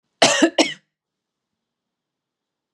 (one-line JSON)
{"cough_length": "2.7 s", "cough_amplitude": 32743, "cough_signal_mean_std_ratio": 0.28, "survey_phase": "beta (2021-08-13 to 2022-03-07)", "age": "45-64", "gender": "Female", "wearing_mask": "No", "symptom_none": true, "smoker_status": "Never smoked", "respiratory_condition_asthma": true, "respiratory_condition_other": false, "recruitment_source": "REACT", "submission_delay": "2 days", "covid_test_result": "Negative", "covid_test_method": "RT-qPCR"}